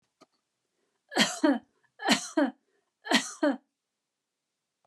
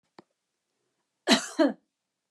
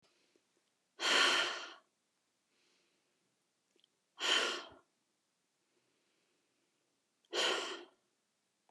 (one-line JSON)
{"three_cough_length": "4.9 s", "three_cough_amplitude": 12567, "three_cough_signal_mean_std_ratio": 0.35, "cough_length": "2.3 s", "cough_amplitude": 16526, "cough_signal_mean_std_ratio": 0.27, "exhalation_length": "8.7 s", "exhalation_amplitude": 4322, "exhalation_signal_mean_std_ratio": 0.32, "survey_phase": "beta (2021-08-13 to 2022-03-07)", "age": "45-64", "gender": "Female", "wearing_mask": "No", "symptom_none": true, "smoker_status": "Never smoked", "respiratory_condition_asthma": false, "respiratory_condition_other": false, "recruitment_source": "REACT", "submission_delay": "1 day", "covid_test_result": "Negative", "covid_test_method": "RT-qPCR"}